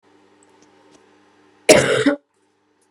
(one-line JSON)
{"cough_length": "2.9 s", "cough_amplitude": 32768, "cough_signal_mean_std_ratio": 0.3, "survey_phase": "beta (2021-08-13 to 2022-03-07)", "age": "18-44", "gender": "Female", "wearing_mask": "No", "symptom_cough_any": true, "symptom_new_continuous_cough": true, "symptom_runny_or_blocked_nose": true, "symptom_diarrhoea": true, "symptom_fever_high_temperature": true, "symptom_headache": true, "symptom_onset": "4 days", "smoker_status": "Never smoked", "respiratory_condition_asthma": false, "respiratory_condition_other": false, "recruitment_source": "Test and Trace", "submission_delay": "2 days", "covid_test_result": "Positive", "covid_test_method": "RT-qPCR"}